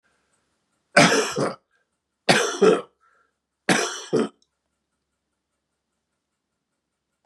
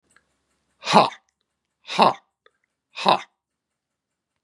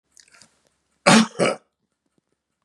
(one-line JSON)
{"three_cough_length": "7.3 s", "three_cough_amplitude": 30970, "three_cough_signal_mean_std_ratio": 0.32, "exhalation_length": "4.4 s", "exhalation_amplitude": 32624, "exhalation_signal_mean_std_ratio": 0.25, "cough_length": "2.6 s", "cough_amplitude": 32767, "cough_signal_mean_std_ratio": 0.28, "survey_phase": "beta (2021-08-13 to 2022-03-07)", "age": "65+", "gender": "Male", "wearing_mask": "No", "symptom_runny_or_blocked_nose": true, "symptom_onset": "4 days", "smoker_status": "Never smoked", "respiratory_condition_asthma": false, "respiratory_condition_other": false, "recruitment_source": "Test and Trace", "submission_delay": "2 days", "covid_test_result": "Positive", "covid_test_method": "ePCR"}